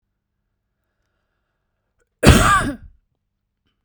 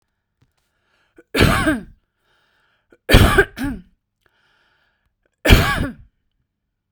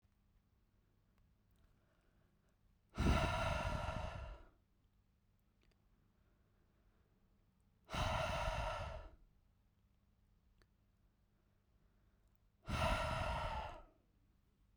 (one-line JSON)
{"cough_length": "3.8 s", "cough_amplitude": 32768, "cough_signal_mean_std_ratio": 0.27, "three_cough_length": "6.9 s", "three_cough_amplitude": 32768, "three_cough_signal_mean_std_ratio": 0.32, "exhalation_length": "14.8 s", "exhalation_amplitude": 2211, "exhalation_signal_mean_std_ratio": 0.41, "survey_phase": "beta (2021-08-13 to 2022-03-07)", "age": "18-44", "gender": "Female", "wearing_mask": "No", "symptom_none": true, "smoker_status": "Never smoked", "respiratory_condition_asthma": false, "respiratory_condition_other": false, "recruitment_source": "REACT", "submission_delay": "1 day", "covid_test_result": "Negative", "covid_test_method": "RT-qPCR"}